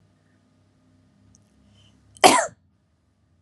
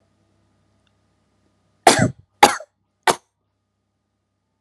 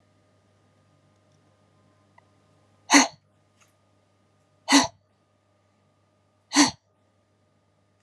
{"cough_length": "3.4 s", "cough_amplitude": 32767, "cough_signal_mean_std_ratio": 0.19, "three_cough_length": "4.6 s", "three_cough_amplitude": 32768, "three_cough_signal_mean_std_ratio": 0.2, "exhalation_length": "8.0 s", "exhalation_amplitude": 28118, "exhalation_signal_mean_std_ratio": 0.2, "survey_phase": "alpha (2021-03-01 to 2021-08-12)", "age": "18-44", "gender": "Female", "wearing_mask": "No", "symptom_fatigue": true, "smoker_status": "Ex-smoker", "respiratory_condition_asthma": false, "respiratory_condition_other": false, "recruitment_source": "REACT", "submission_delay": "1 day", "covid_test_result": "Negative", "covid_test_method": "RT-qPCR"}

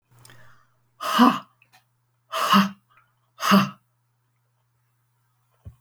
{"exhalation_length": "5.8 s", "exhalation_amplitude": 22416, "exhalation_signal_mean_std_ratio": 0.31, "survey_phase": "beta (2021-08-13 to 2022-03-07)", "age": "65+", "gender": "Female", "wearing_mask": "No", "symptom_none": true, "smoker_status": "Never smoked", "respiratory_condition_asthma": false, "respiratory_condition_other": false, "recruitment_source": "REACT", "submission_delay": "3 days", "covid_test_result": "Negative", "covid_test_method": "RT-qPCR", "influenza_a_test_result": "Negative", "influenza_b_test_result": "Negative"}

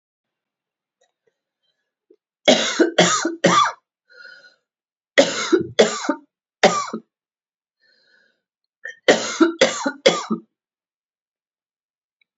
{"three_cough_length": "12.4 s", "three_cough_amplitude": 32623, "three_cough_signal_mean_std_ratio": 0.35, "survey_phase": "beta (2021-08-13 to 2022-03-07)", "age": "45-64", "gender": "Female", "wearing_mask": "No", "symptom_cough_any": true, "symptom_runny_or_blocked_nose": true, "symptom_sore_throat": true, "symptom_fatigue": true, "symptom_headache": true, "symptom_onset": "2 days", "smoker_status": "Ex-smoker", "respiratory_condition_asthma": false, "respiratory_condition_other": false, "recruitment_source": "Test and Trace", "submission_delay": "1 day", "covid_test_result": "Positive", "covid_test_method": "RT-qPCR", "covid_ct_value": 30.0, "covid_ct_gene": "ORF1ab gene"}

